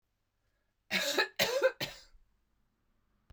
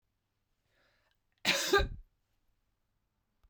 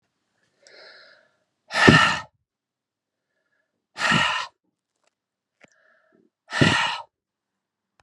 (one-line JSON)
{"cough_length": "3.3 s", "cough_amplitude": 7454, "cough_signal_mean_std_ratio": 0.38, "three_cough_length": "3.5 s", "three_cough_amplitude": 5954, "three_cough_signal_mean_std_ratio": 0.28, "exhalation_length": "8.0 s", "exhalation_amplitude": 32768, "exhalation_signal_mean_std_ratio": 0.3, "survey_phase": "beta (2021-08-13 to 2022-03-07)", "age": "65+", "gender": "Female", "wearing_mask": "No", "symptom_none": true, "symptom_onset": "12 days", "smoker_status": "Never smoked", "respiratory_condition_asthma": false, "respiratory_condition_other": false, "recruitment_source": "REACT", "submission_delay": "1 day", "covid_test_result": "Negative", "covid_test_method": "RT-qPCR"}